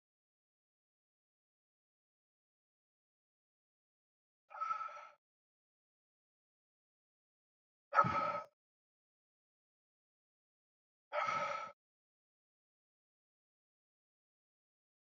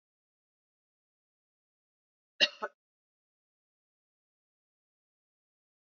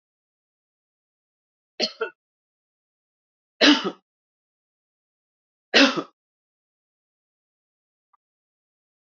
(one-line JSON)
{"exhalation_length": "15.1 s", "exhalation_amplitude": 5800, "exhalation_signal_mean_std_ratio": 0.22, "cough_length": "6.0 s", "cough_amplitude": 8657, "cough_signal_mean_std_ratio": 0.1, "three_cough_length": "9.0 s", "three_cough_amplitude": 22937, "three_cough_signal_mean_std_ratio": 0.19, "survey_phase": "beta (2021-08-13 to 2022-03-07)", "age": "18-44", "gender": "Male", "wearing_mask": "No", "symptom_cough_any": true, "symptom_runny_or_blocked_nose": true, "symptom_onset": "4 days", "smoker_status": "Ex-smoker", "respiratory_condition_asthma": false, "respiratory_condition_other": false, "recruitment_source": "Test and Trace", "submission_delay": "2 days", "covid_test_result": "Positive", "covid_test_method": "RT-qPCR", "covid_ct_value": 19.5, "covid_ct_gene": "N gene", "covid_ct_mean": 20.6, "covid_viral_load": "180000 copies/ml", "covid_viral_load_category": "Low viral load (10K-1M copies/ml)"}